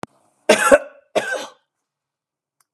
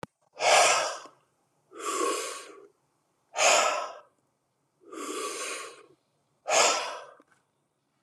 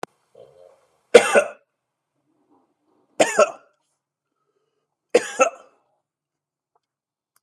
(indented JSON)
{
  "cough_length": "2.7 s",
  "cough_amplitude": 32768,
  "cough_signal_mean_std_ratio": 0.3,
  "exhalation_length": "8.0 s",
  "exhalation_amplitude": 13448,
  "exhalation_signal_mean_std_ratio": 0.44,
  "three_cough_length": "7.4 s",
  "three_cough_amplitude": 32768,
  "three_cough_signal_mean_std_ratio": 0.21,
  "survey_phase": "beta (2021-08-13 to 2022-03-07)",
  "age": "45-64",
  "gender": "Male",
  "wearing_mask": "No",
  "symptom_cough_any": true,
  "symptom_new_continuous_cough": true,
  "symptom_runny_or_blocked_nose": true,
  "symptom_shortness_of_breath": true,
  "symptom_sore_throat": true,
  "symptom_diarrhoea": true,
  "symptom_fatigue": true,
  "symptom_headache": true,
  "symptom_onset": "3 days",
  "smoker_status": "Ex-smoker",
  "respiratory_condition_asthma": false,
  "respiratory_condition_other": false,
  "recruitment_source": "Test and Trace",
  "submission_delay": "1 day",
  "covid_test_result": "Negative",
  "covid_test_method": "RT-qPCR"
}